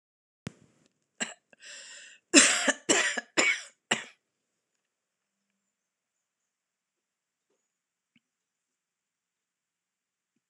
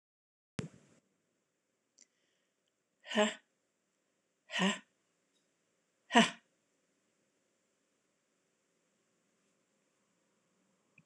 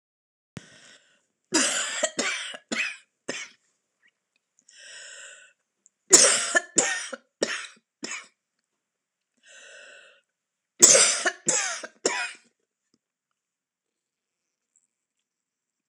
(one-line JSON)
{"cough_length": "10.5 s", "cough_amplitude": 23249, "cough_signal_mean_std_ratio": 0.23, "exhalation_length": "11.1 s", "exhalation_amplitude": 12406, "exhalation_signal_mean_std_ratio": 0.18, "three_cough_length": "15.9 s", "three_cough_amplitude": 26028, "three_cough_signal_mean_std_ratio": 0.3, "survey_phase": "alpha (2021-03-01 to 2021-08-12)", "age": "65+", "gender": "Female", "wearing_mask": "No", "symptom_none": true, "smoker_status": "Never smoked", "respiratory_condition_asthma": false, "respiratory_condition_other": false, "recruitment_source": "REACT", "submission_delay": "3 days", "covid_test_result": "Negative", "covid_test_method": "RT-qPCR"}